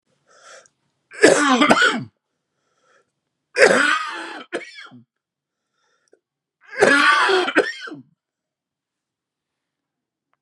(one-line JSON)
{"three_cough_length": "10.4 s", "three_cough_amplitude": 32768, "three_cough_signal_mean_std_ratio": 0.38, "survey_phase": "beta (2021-08-13 to 2022-03-07)", "age": "45-64", "gender": "Male", "wearing_mask": "No", "symptom_cough_any": true, "symptom_sore_throat": true, "symptom_fatigue": true, "symptom_headache": true, "symptom_change_to_sense_of_smell_or_taste": true, "symptom_onset": "3 days", "smoker_status": "Never smoked", "respiratory_condition_asthma": false, "respiratory_condition_other": false, "recruitment_source": "Test and Trace", "submission_delay": "2 days", "covid_test_result": "Positive", "covid_test_method": "RT-qPCR"}